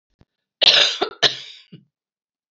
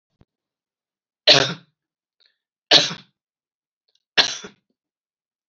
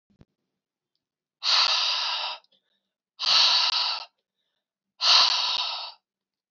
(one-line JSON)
{"cough_length": "2.5 s", "cough_amplitude": 28702, "cough_signal_mean_std_ratio": 0.34, "three_cough_length": "5.5 s", "three_cough_amplitude": 32617, "three_cough_signal_mean_std_ratio": 0.23, "exhalation_length": "6.5 s", "exhalation_amplitude": 18875, "exhalation_signal_mean_std_ratio": 0.49, "survey_phase": "beta (2021-08-13 to 2022-03-07)", "age": "45-64", "gender": "Female", "wearing_mask": "No", "symptom_cough_any": true, "symptom_runny_or_blocked_nose": true, "symptom_sore_throat": true, "symptom_onset": "3 days", "smoker_status": "Never smoked", "respiratory_condition_asthma": false, "respiratory_condition_other": false, "recruitment_source": "Test and Trace", "submission_delay": "2 days", "covid_test_result": "Positive", "covid_test_method": "RT-qPCR", "covid_ct_value": 19.1, "covid_ct_gene": "ORF1ab gene", "covid_ct_mean": 19.6, "covid_viral_load": "370000 copies/ml", "covid_viral_load_category": "Low viral load (10K-1M copies/ml)"}